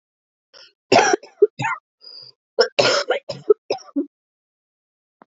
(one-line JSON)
{"cough_length": "5.3 s", "cough_amplitude": 27788, "cough_signal_mean_std_ratio": 0.34, "survey_phase": "alpha (2021-03-01 to 2021-08-12)", "age": "45-64", "gender": "Female", "wearing_mask": "No", "symptom_cough_any": true, "symptom_shortness_of_breath": true, "symptom_fatigue": true, "symptom_fever_high_temperature": true, "symptom_headache": true, "symptom_onset": "5 days", "smoker_status": "Current smoker (e-cigarettes or vapes only)", "respiratory_condition_asthma": false, "respiratory_condition_other": false, "recruitment_source": "Test and Trace", "submission_delay": "2 days", "covid_test_result": "Positive", "covid_test_method": "RT-qPCR", "covid_ct_value": 17.4, "covid_ct_gene": "ORF1ab gene", "covid_ct_mean": 18.1, "covid_viral_load": "1200000 copies/ml", "covid_viral_load_category": "High viral load (>1M copies/ml)"}